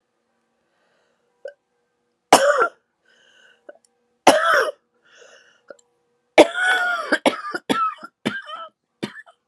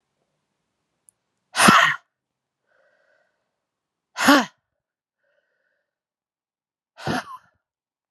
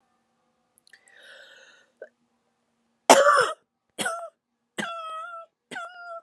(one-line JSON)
{"three_cough_length": "9.5 s", "three_cough_amplitude": 32768, "three_cough_signal_mean_std_ratio": 0.34, "exhalation_length": "8.1 s", "exhalation_amplitude": 32768, "exhalation_signal_mean_std_ratio": 0.23, "cough_length": "6.2 s", "cough_amplitude": 31989, "cough_signal_mean_std_ratio": 0.28, "survey_phase": "beta (2021-08-13 to 2022-03-07)", "age": "45-64", "gender": "Female", "wearing_mask": "No", "symptom_cough_any": true, "symptom_runny_or_blocked_nose": true, "symptom_shortness_of_breath": true, "symptom_sore_throat": true, "symptom_headache": true, "symptom_onset": "3 days", "smoker_status": "Ex-smoker", "respiratory_condition_asthma": true, "respiratory_condition_other": false, "recruitment_source": "Test and Trace", "submission_delay": "1 day", "covid_test_result": "Positive", "covid_test_method": "RT-qPCR", "covid_ct_value": 19.9, "covid_ct_gene": "ORF1ab gene"}